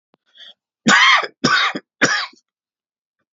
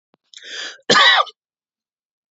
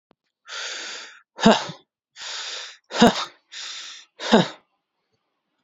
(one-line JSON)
{"three_cough_length": "3.3 s", "three_cough_amplitude": 31173, "three_cough_signal_mean_std_ratio": 0.43, "cough_length": "2.3 s", "cough_amplitude": 30630, "cough_signal_mean_std_ratio": 0.35, "exhalation_length": "5.6 s", "exhalation_amplitude": 29896, "exhalation_signal_mean_std_ratio": 0.32, "survey_phase": "beta (2021-08-13 to 2022-03-07)", "age": "45-64", "gender": "Male", "wearing_mask": "No", "symptom_runny_or_blocked_nose": true, "symptom_fatigue": true, "symptom_headache": true, "symptom_onset": "12 days", "smoker_status": "Never smoked", "respiratory_condition_asthma": false, "respiratory_condition_other": false, "recruitment_source": "REACT", "submission_delay": "2 days", "covid_test_result": "Negative", "covid_test_method": "RT-qPCR", "influenza_a_test_result": "Negative", "influenza_b_test_result": "Negative"}